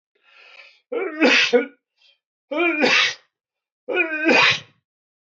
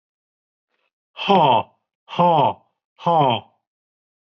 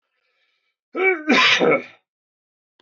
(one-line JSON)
{"three_cough_length": "5.4 s", "three_cough_amplitude": 19632, "three_cough_signal_mean_std_ratio": 0.49, "exhalation_length": "4.4 s", "exhalation_amplitude": 21152, "exhalation_signal_mean_std_ratio": 0.41, "cough_length": "2.8 s", "cough_amplitude": 19956, "cough_signal_mean_std_ratio": 0.43, "survey_phase": "beta (2021-08-13 to 2022-03-07)", "age": "45-64", "gender": "Male", "wearing_mask": "No", "symptom_cough_any": true, "symptom_sore_throat": true, "smoker_status": "Ex-smoker", "respiratory_condition_asthma": false, "respiratory_condition_other": false, "recruitment_source": "Test and Trace", "submission_delay": "2 days", "covid_test_result": "Positive", "covid_test_method": "ePCR"}